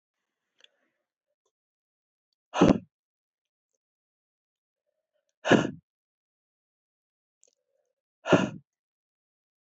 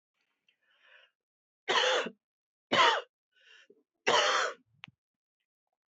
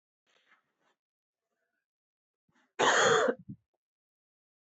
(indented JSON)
{
  "exhalation_length": "9.7 s",
  "exhalation_amplitude": 18607,
  "exhalation_signal_mean_std_ratio": 0.18,
  "three_cough_length": "5.9 s",
  "three_cough_amplitude": 11673,
  "three_cough_signal_mean_std_ratio": 0.35,
  "cough_length": "4.6 s",
  "cough_amplitude": 7086,
  "cough_signal_mean_std_ratio": 0.28,
  "survey_phase": "beta (2021-08-13 to 2022-03-07)",
  "age": "45-64",
  "gender": "Female",
  "wearing_mask": "Yes",
  "symptom_cough_any": true,
  "symptom_runny_or_blocked_nose": true,
  "symptom_fatigue": true,
  "symptom_change_to_sense_of_smell_or_taste": true,
  "smoker_status": "Never smoked",
  "respiratory_condition_asthma": false,
  "respiratory_condition_other": false,
  "recruitment_source": "Test and Trace",
  "submission_delay": "2 days",
  "covid_test_result": "Positive",
  "covid_test_method": "RT-qPCR",
  "covid_ct_value": 21.4,
  "covid_ct_gene": "S gene",
  "covid_ct_mean": 22.2,
  "covid_viral_load": "52000 copies/ml",
  "covid_viral_load_category": "Low viral load (10K-1M copies/ml)"
}